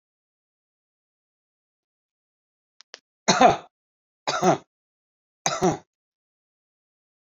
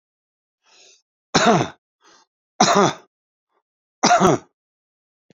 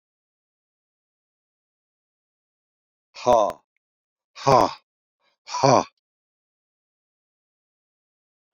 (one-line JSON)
{"three_cough_length": "7.3 s", "three_cough_amplitude": 24969, "three_cough_signal_mean_std_ratio": 0.24, "cough_length": "5.4 s", "cough_amplitude": 27370, "cough_signal_mean_std_ratio": 0.34, "exhalation_length": "8.5 s", "exhalation_amplitude": 26214, "exhalation_signal_mean_std_ratio": 0.21, "survey_phase": "beta (2021-08-13 to 2022-03-07)", "age": "65+", "gender": "Male", "wearing_mask": "No", "symptom_none": true, "smoker_status": "Current smoker (1 to 10 cigarettes per day)", "respiratory_condition_asthma": false, "respiratory_condition_other": false, "recruitment_source": "REACT", "submission_delay": "2 days", "covid_test_result": "Negative", "covid_test_method": "RT-qPCR"}